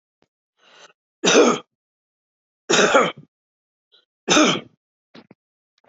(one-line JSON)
{"three_cough_length": "5.9 s", "three_cough_amplitude": 25688, "three_cough_signal_mean_std_ratio": 0.34, "survey_phase": "alpha (2021-03-01 to 2021-08-12)", "age": "65+", "gender": "Male", "wearing_mask": "No", "symptom_none": true, "smoker_status": "Never smoked", "respiratory_condition_asthma": false, "respiratory_condition_other": false, "recruitment_source": "REACT", "submission_delay": "3 days", "covid_test_result": "Negative", "covid_test_method": "RT-qPCR"}